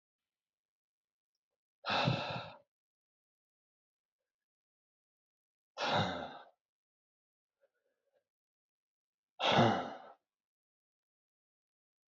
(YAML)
exhalation_length: 12.1 s
exhalation_amplitude: 5463
exhalation_signal_mean_std_ratio: 0.27
survey_phase: beta (2021-08-13 to 2022-03-07)
age: 45-64
gender: Male
wearing_mask: 'No'
symptom_cough_any: true
symptom_runny_or_blocked_nose: true
symptom_sore_throat: true
symptom_diarrhoea: true
symptom_headache: true
symptom_onset: 3 days
smoker_status: Ex-smoker
respiratory_condition_asthma: false
respiratory_condition_other: false
recruitment_source: Test and Trace
submission_delay: 2 days
covid_test_result: Positive
covid_test_method: RT-qPCR
covid_ct_value: 25.2
covid_ct_gene: ORF1ab gene
covid_ct_mean: 25.8
covid_viral_load: 3400 copies/ml
covid_viral_load_category: Minimal viral load (< 10K copies/ml)